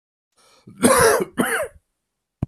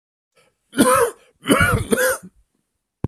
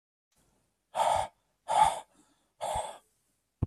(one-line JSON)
{"cough_length": "2.5 s", "cough_amplitude": 29215, "cough_signal_mean_std_ratio": 0.44, "three_cough_length": "3.1 s", "three_cough_amplitude": 28925, "three_cough_signal_mean_std_ratio": 0.47, "exhalation_length": "3.7 s", "exhalation_amplitude": 8522, "exhalation_signal_mean_std_ratio": 0.38, "survey_phase": "alpha (2021-03-01 to 2021-08-12)", "age": "45-64", "gender": "Male", "wearing_mask": "No", "symptom_none": true, "smoker_status": "Ex-smoker", "respiratory_condition_asthma": false, "respiratory_condition_other": false, "recruitment_source": "REACT", "submission_delay": "1 day", "covid_test_result": "Negative", "covid_test_method": "RT-qPCR"}